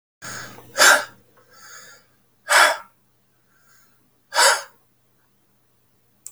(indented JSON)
{
  "exhalation_length": "6.3 s",
  "exhalation_amplitude": 32768,
  "exhalation_signal_mean_std_ratio": 0.3,
  "survey_phase": "beta (2021-08-13 to 2022-03-07)",
  "age": "65+",
  "gender": "Male",
  "wearing_mask": "No",
  "symptom_none": true,
  "smoker_status": "Ex-smoker",
  "respiratory_condition_asthma": false,
  "respiratory_condition_other": false,
  "recruitment_source": "REACT",
  "submission_delay": "1 day",
  "covid_test_result": "Negative",
  "covid_test_method": "RT-qPCR",
  "influenza_a_test_result": "Negative",
  "influenza_b_test_result": "Negative"
}